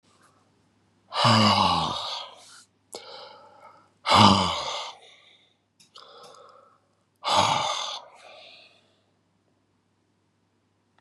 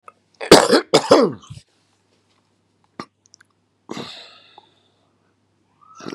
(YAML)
exhalation_length: 11.0 s
exhalation_amplitude: 27683
exhalation_signal_mean_std_ratio: 0.36
cough_length: 6.1 s
cough_amplitude: 32768
cough_signal_mean_std_ratio: 0.25
survey_phase: beta (2021-08-13 to 2022-03-07)
age: 65+
gender: Male
wearing_mask: 'No'
symptom_cough_any: true
symptom_runny_or_blocked_nose: true
symptom_fatigue: true
symptom_headache: true
symptom_other: true
smoker_status: Ex-smoker
respiratory_condition_asthma: true
respiratory_condition_other: false
recruitment_source: Test and Trace
submission_delay: 2 days
covid_test_result: Positive
covid_test_method: RT-qPCR
covid_ct_value: 27.5
covid_ct_gene: ORF1ab gene
covid_ct_mean: 27.8
covid_viral_load: 770 copies/ml
covid_viral_load_category: Minimal viral load (< 10K copies/ml)